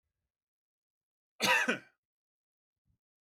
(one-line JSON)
{"cough_length": "3.2 s", "cough_amplitude": 6416, "cough_signal_mean_std_ratio": 0.26, "survey_phase": "beta (2021-08-13 to 2022-03-07)", "age": "18-44", "gender": "Male", "wearing_mask": "No", "symptom_none": true, "smoker_status": "Ex-smoker", "respiratory_condition_asthma": false, "respiratory_condition_other": false, "recruitment_source": "REACT", "submission_delay": "2 days", "covid_test_result": "Negative", "covid_test_method": "RT-qPCR", "influenza_a_test_result": "Negative", "influenza_b_test_result": "Negative"}